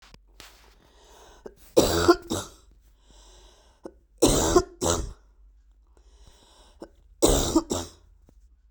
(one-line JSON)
{"cough_length": "8.7 s", "cough_amplitude": 23002, "cough_signal_mean_std_ratio": 0.35, "survey_phase": "beta (2021-08-13 to 2022-03-07)", "age": "18-44", "gender": "Female", "wearing_mask": "No", "symptom_cough_any": true, "symptom_runny_or_blocked_nose": true, "symptom_sore_throat": true, "symptom_fatigue": true, "symptom_change_to_sense_of_smell_or_taste": true, "symptom_loss_of_taste": true, "symptom_onset": "4 days", "smoker_status": "Never smoked", "respiratory_condition_asthma": false, "respiratory_condition_other": false, "recruitment_source": "Test and Trace", "submission_delay": "2 days", "covid_test_result": "Positive", "covid_test_method": "RT-qPCR", "covid_ct_value": 23.6, "covid_ct_gene": "ORF1ab gene"}